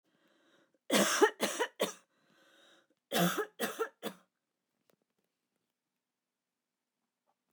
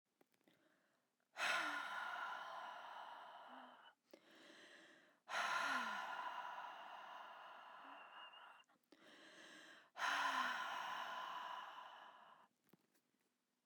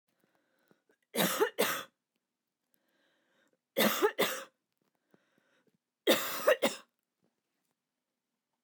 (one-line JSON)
{"cough_length": "7.5 s", "cough_amplitude": 8411, "cough_signal_mean_std_ratio": 0.31, "exhalation_length": "13.7 s", "exhalation_amplitude": 1154, "exhalation_signal_mean_std_ratio": 0.6, "three_cough_length": "8.6 s", "three_cough_amplitude": 8098, "three_cough_signal_mean_std_ratio": 0.32, "survey_phase": "beta (2021-08-13 to 2022-03-07)", "age": "45-64", "gender": "Female", "wearing_mask": "No", "symptom_none": true, "smoker_status": "Never smoked", "respiratory_condition_asthma": false, "respiratory_condition_other": false, "recruitment_source": "REACT", "submission_delay": "2 days", "covid_test_result": "Negative", "covid_test_method": "RT-qPCR"}